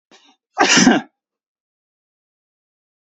{"cough_length": "3.2 s", "cough_amplitude": 30426, "cough_signal_mean_std_ratio": 0.29, "survey_phase": "beta (2021-08-13 to 2022-03-07)", "age": "45-64", "gender": "Male", "wearing_mask": "No", "symptom_none": true, "smoker_status": "Never smoked", "respiratory_condition_asthma": false, "respiratory_condition_other": false, "recruitment_source": "REACT", "submission_delay": "22 days", "covid_test_result": "Negative", "covid_test_method": "RT-qPCR", "influenza_a_test_result": "Negative", "influenza_b_test_result": "Negative"}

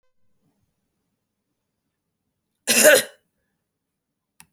{"cough_length": "4.5 s", "cough_amplitude": 31609, "cough_signal_mean_std_ratio": 0.21, "survey_phase": "beta (2021-08-13 to 2022-03-07)", "age": "45-64", "gender": "Female", "wearing_mask": "No", "symptom_none": true, "smoker_status": "Never smoked", "respiratory_condition_asthma": false, "respiratory_condition_other": false, "recruitment_source": "REACT", "submission_delay": "1 day", "covid_test_result": "Negative", "covid_test_method": "RT-qPCR"}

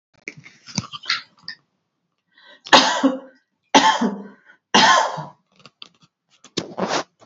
{"three_cough_length": "7.3 s", "three_cough_amplitude": 29495, "three_cough_signal_mean_std_ratio": 0.37, "survey_phase": "beta (2021-08-13 to 2022-03-07)", "age": "45-64", "gender": "Female", "wearing_mask": "No", "symptom_none": true, "smoker_status": "Ex-smoker", "respiratory_condition_asthma": false, "respiratory_condition_other": false, "recruitment_source": "REACT", "submission_delay": "1 day", "covid_test_result": "Negative", "covid_test_method": "RT-qPCR"}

